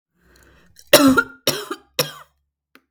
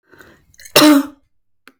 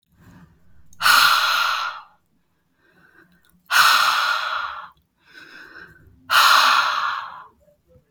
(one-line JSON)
{"three_cough_length": "2.9 s", "three_cough_amplitude": 32768, "three_cough_signal_mean_std_ratio": 0.32, "cough_length": "1.8 s", "cough_amplitude": 32768, "cough_signal_mean_std_ratio": 0.36, "exhalation_length": "8.1 s", "exhalation_amplitude": 28494, "exhalation_signal_mean_std_ratio": 0.5, "survey_phase": "beta (2021-08-13 to 2022-03-07)", "age": "18-44", "gender": "Female", "wearing_mask": "No", "symptom_none": true, "symptom_onset": "5 days", "smoker_status": "Ex-smoker", "respiratory_condition_asthma": false, "respiratory_condition_other": false, "recruitment_source": "REACT", "submission_delay": "1 day", "covid_test_result": "Negative", "covid_test_method": "RT-qPCR"}